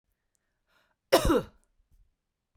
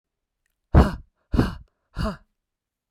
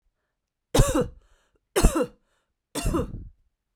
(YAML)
cough_length: 2.6 s
cough_amplitude: 16769
cough_signal_mean_std_ratio: 0.26
exhalation_length: 2.9 s
exhalation_amplitude: 26826
exhalation_signal_mean_std_ratio: 0.3
three_cough_length: 3.8 s
three_cough_amplitude: 22705
three_cough_signal_mean_std_ratio: 0.37
survey_phase: beta (2021-08-13 to 2022-03-07)
age: 18-44
gender: Female
wearing_mask: 'No'
symptom_runny_or_blocked_nose: true
symptom_sore_throat: true
symptom_headache: true
symptom_change_to_sense_of_smell_or_taste: true
symptom_onset: 5 days
smoker_status: Never smoked
respiratory_condition_asthma: false
respiratory_condition_other: false
recruitment_source: Test and Trace
submission_delay: 2 days
covid_test_result: Positive
covid_test_method: RT-qPCR
covid_ct_value: 28.1
covid_ct_gene: ORF1ab gene